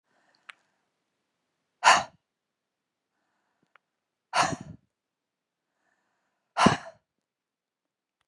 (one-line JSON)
{"exhalation_length": "8.3 s", "exhalation_amplitude": 20855, "exhalation_signal_mean_std_ratio": 0.2, "survey_phase": "beta (2021-08-13 to 2022-03-07)", "age": "45-64", "gender": "Female", "wearing_mask": "No", "symptom_cough_any": true, "symptom_new_continuous_cough": true, "symptom_shortness_of_breath": true, "symptom_fatigue": true, "symptom_headache": true, "symptom_onset": "5 days", "smoker_status": "Never smoked", "respiratory_condition_asthma": false, "respiratory_condition_other": false, "recruitment_source": "Test and Trace", "submission_delay": "1 day", "covid_test_result": "Negative", "covid_test_method": "RT-qPCR"}